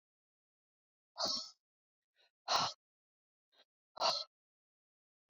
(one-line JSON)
{"exhalation_length": "5.3 s", "exhalation_amplitude": 3347, "exhalation_signal_mean_std_ratio": 0.29, "survey_phase": "beta (2021-08-13 to 2022-03-07)", "age": "65+", "gender": "Female", "wearing_mask": "No", "symptom_none": true, "smoker_status": "Ex-smoker", "respiratory_condition_asthma": false, "respiratory_condition_other": false, "recruitment_source": "REACT", "submission_delay": "1 day", "covid_test_result": "Negative", "covid_test_method": "RT-qPCR"}